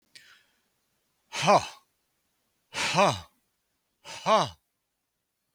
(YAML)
exhalation_length: 5.5 s
exhalation_amplitude: 13910
exhalation_signal_mean_std_ratio: 0.31
survey_phase: beta (2021-08-13 to 2022-03-07)
age: 65+
gender: Male
wearing_mask: 'No'
symptom_runny_or_blocked_nose: true
smoker_status: Never smoked
respiratory_condition_asthma: false
respiratory_condition_other: false
recruitment_source: REACT
submission_delay: 2 days
covid_test_result: Negative
covid_test_method: RT-qPCR
influenza_a_test_result: Negative
influenza_b_test_result: Negative